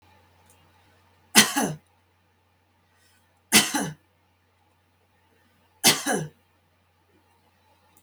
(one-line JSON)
{"three_cough_length": "8.0 s", "three_cough_amplitude": 32567, "three_cough_signal_mean_std_ratio": 0.25, "survey_phase": "beta (2021-08-13 to 2022-03-07)", "age": "65+", "gender": "Female", "wearing_mask": "No", "symptom_none": true, "smoker_status": "Ex-smoker", "respiratory_condition_asthma": false, "respiratory_condition_other": false, "recruitment_source": "REACT", "submission_delay": "2 days", "covid_test_result": "Negative", "covid_test_method": "RT-qPCR", "influenza_a_test_result": "Negative", "influenza_b_test_result": "Negative"}